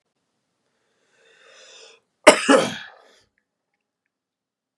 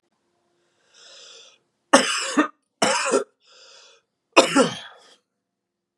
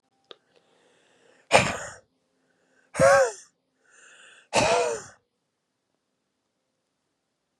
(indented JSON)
{
  "cough_length": "4.8 s",
  "cough_amplitude": 32768,
  "cough_signal_mean_std_ratio": 0.2,
  "three_cough_length": "6.0 s",
  "three_cough_amplitude": 32764,
  "three_cough_signal_mean_std_ratio": 0.33,
  "exhalation_length": "7.6 s",
  "exhalation_amplitude": 29888,
  "exhalation_signal_mean_std_ratio": 0.29,
  "survey_phase": "beta (2021-08-13 to 2022-03-07)",
  "age": "18-44",
  "gender": "Male",
  "wearing_mask": "No",
  "symptom_cough_any": true,
  "symptom_runny_or_blocked_nose": true,
  "symptom_sore_throat": true,
  "symptom_fatigue": true,
  "symptom_fever_high_temperature": true,
  "symptom_headache": true,
  "symptom_onset": "2 days",
  "smoker_status": "Never smoked",
  "respiratory_condition_asthma": true,
  "respiratory_condition_other": false,
  "recruitment_source": "Test and Trace",
  "submission_delay": "1 day",
  "covid_test_result": "Positive",
  "covid_test_method": "RT-qPCR",
  "covid_ct_value": 15.2,
  "covid_ct_gene": "N gene"
}